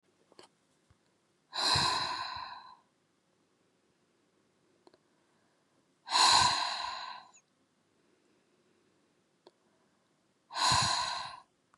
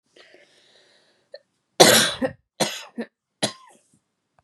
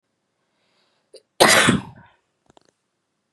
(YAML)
exhalation_length: 11.8 s
exhalation_amplitude: 9050
exhalation_signal_mean_std_ratio: 0.36
three_cough_length: 4.4 s
three_cough_amplitude: 32768
three_cough_signal_mean_std_ratio: 0.27
cough_length: 3.3 s
cough_amplitude: 32768
cough_signal_mean_std_ratio: 0.28
survey_phase: beta (2021-08-13 to 2022-03-07)
age: 18-44
gender: Female
wearing_mask: 'No'
symptom_none: true
smoker_status: Never smoked
respiratory_condition_asthma: false
respiratory_condition_other: false
recruitment_source: REACT
submission_delay: 3 days
covid_test_result: Negative
covid_test_method: RT-qPCR
influenza_a_test_result: Negative
influenza_b_test_result: Negative